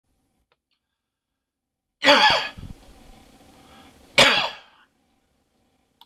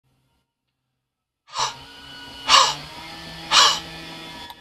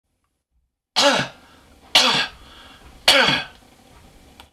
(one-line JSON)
{"cough_length": "6.1 s", "cough_amplitude": 23754, "cough_signal_mean_std_ratio": 0.28, "exhalation_length": "4.6 s", "exhalation_amplitude": 26028, "exhalation_signal_mean_std_ratio": 0.37, "three_cough_length": "4.5 s", "three_cough_amplitude": 23552, "three_cough_signal_mean_std_ratio": 0.39, "survey_phase": "beta (2021-08-13 to 2022-03-07)", "age": "65+", "gender": "Male", "wearing_mask": "No", "symptom_runny_or_blocked_nose": true, "smoker_status": "Never smoked", "respiratory_condition_asthma": false, "respiratory_condition_other": false, "recruitment_source": "REACT", "submission_delay": "1 day", "covid_test_result": "Negative", "covid_test_method": "RT-qPCR", "influenza_a_test_result": "Negative", "influenza_b_test_result": "Negative"}